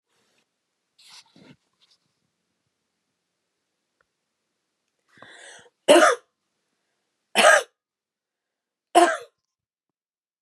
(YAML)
three_cough_length: 10.4 s
three_cough_amplitude: 28176
three_cough_signal_mean_std_ratio: 0.21
survey_phase: alpha (2021-03-01 to 2021-08-12)
age: 45-64
gender: Female
wearing_mask: 'No'
symptom_none: true
smoker_status: Never smoked
respiratory_condition_asthma: false
respiratory_condition_other: false
recruitment_source: REACT
submission_delay: 1 day
covid_test_result: Negative
covid_test_method: RT-qPCR